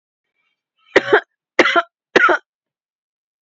{"three_cough_length": "3.4 s", "three_cough_amplitude": 31958, "three_cough_signal_mean_std_ratio": 0.32, "survey_phase": "beta (2021-08-13 to 2022-03-07)", "age": "45-64", "gender": "Female", "wearing_mask": "Yes", "symptom_sore_throat": true, "smoker_status": "Never smoked", "respiratory_condition_asthma": false, "respiratory_condition_other": false, "recruitment_source": "Test and Trace", "submission_delay": "2 days", "covid_test_result": "Positive", "covid_test_method": "RT-qPCR", "covid_ct_value": 20.5, "covid_ct_gene": "ORF1ab gene", "covid_ct_mean": 20.7, "covid_viral_load": "170000 copies/ml", "covid_viral_load_category": "Low viral load (10K-1M copies/ml)"}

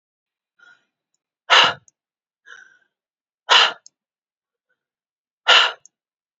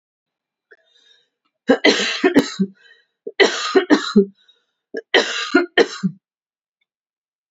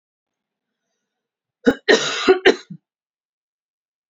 {"exhalation_length": "6.4 s", "exhalation_amplitude": 31562, "exhalation_signal_mean_std_ratio": 0.25, "three_cough_length": "7.5 s", "three_cough_amplitude": 32767, "three_cough_signal_mean_std_ratio": 0.38, "cough_length": "4.1 s", "cough_amplitude": 29436, "cough_signal_mean_std_ratio": 0.27, "survey_phase": "beta (2021-08-13 to 2022-03-07)", "age": "18-44", "gender": "Female", "wearing_mask": "No", "symptom_none": true, "smoker_status": "Never smoked", "respiratory_condition_asthma": false, "respiratory_condition_other": false, "recruitment_source": "REACT", "submission_delay": "3 days", "covid_test_result": "Negative", "covid_test_method": "RT-qPCR"}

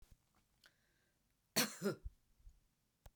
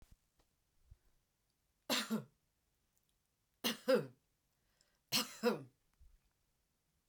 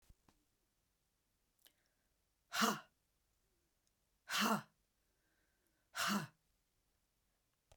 {"cough_length": "3.2 s", "cough_amplitude": 2833, "cough_signal_mean_std_ratio": 0.26, "three_cough_length": "7.1 s", "three_cough_amplitude": 3043, "three_cough_signal_mean_std_ratio": 0.28, "exhalation_length": "7.8 s", "exhalation_amplitude": 3082, "exhalation_signal_mean_std_ratio": 0.27, "survey_phase": "beta (2021-08-13 to 2022-03-07)", "age": "65+", "gender": "Female", "wearing_mask": "No", "symptom_runny_or_blocked_nose": true, "symptom_onset": "8 days", "smoker_status": "Never smoked", "respiratory_condition_asthma": false, "respiratory_condition_other": false, "recruitment_source": "REACT", "submission_delay": "2 days", "covid_test_result": "Negative", "covid_test_method": "RT-qPCR"}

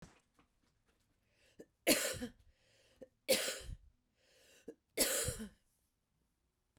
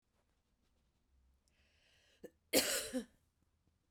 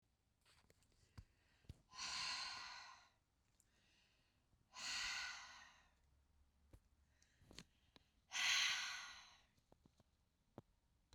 {"three_cough_length": "6.8 s", "three_cough_amplitude": 5334, "three_cough_signal_mean_std_ratio": 0.32, "cough_length": "3.9 s", "cough_amplitude": 4553, "cough_signal_mean_std_ratio": 0.26, "exhalation_length": "11.1 s", "exhalation_amplitude": 1504, "exhalation_signal_mean_std_ratio": 0.38, "survey_phase": "beta (2021-08-13 to 2022-03-07)", "age": "45-64", "gender": "Female", "wearing_mask": "No", "symptom_none": true, "smoker_status": "Never smoked", "respiratory_condition_asthma": false, "respiratory_condition_other": false, "recruitment_source": "REACT", "submission_delay": "1 day", "covid_test_result": "Negative", "covid_test_method": "RT-qPCR", "influenza_a_test_result": "Negative", "influenza_b_test_result": "Negative"}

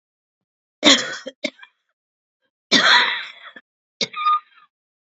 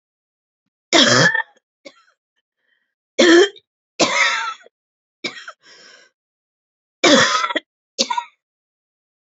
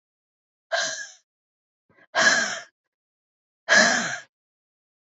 {"cough_length": "5.1 s", "cough_amplitude": 32768, "cough_signal_mean_std_ratio": 0.35, "three_cough_length": "9.4 s", "three_cough_amplitude": 32768, "three_cough_signal_mean_std_ratio": 0.36, "exhalation_length": "5.0 s", "exhalation_amplitude": 20068, "exhalation_signal_mean_std_ratio": 0.36, "survey_phase": "beta (2021-08-13 to 2022-03-07)", "age": "45-64", "gender": "Female", "wearing_mask": "No", "symptom_cough_any": true, "symptom_new_continuous_cough": true, "symptom_runny_or_blocked_nose": true, "symptom_shortness_of_breath": true, "symptom_sore_throat": true, "symptom_fatigue": true, "symptom_fever_high_temperature": true, "symptom_headache": true, "symptom_other": true, "symptom_onset": "6 days", "smoker_status": "Ex-smoker", "respiratory_condition_asthma": false, "respiratory_condition_other": false, "recruitment_source": "Test and Trace", "submission_delay": "2 days", "covid_test_result": "Positive", "covid_test_method": "RT-qPCR", "covid_ct_value": 19.2, "covid_ct_gene": "ORF1ab gene"}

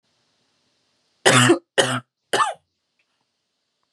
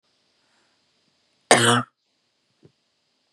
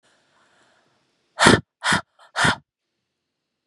{"three_cough_length": "3.9 s", "three_cough_amplitude": 32716, "three_cough_signal_mean_std_ratio": 0.32, "cough_length": "3.3 s", "cough_amplitude": 32612, "cough_signal_mean_std_ratio": 0.23, "exhalation_length": "3.7 s", "exhalation_amplitude": 32735, "exhalation_signal_mean_std_ratio": 0.28, "survey_phase": "beta (2021-08-13 to 2022-03-07)", "age": "18-44", "gender": "Female", "wearing_mask": "No", "symptom_none": true, "smoker_status": "Never smoked", "respiratory_condition_asthma": false, "respiratory_condition_other": false, "recruitment_source": "REACT", "submission_delay": "0 days", "covid_test_result": "Negative", "covid_test_method": "RT-qPCR", "influenza_a_test_result": "Negative", "influenza_b_test_result": "Negative"}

